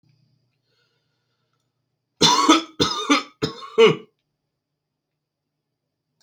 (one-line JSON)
{"three_cough_length": "6.2 s", "three_cough_amplitude": 30559, "three_cough_signal_mean_std_ratio": 0.31, "survey_phase": "beta (2021-08-13 to 2022-03-07)", "age": "18-44", "gender": "Male", "wearing_mask": "No", "symptom_none": true, "smoker_status": "Never smoked", "respiratory_condition_asthma": false, "respiratory_condition_other": false, "recruitment_source": "REACT", "submission_delay": "2 days", "covid_test_result": "Negative", "covid_test_method": "RT-qPCR"}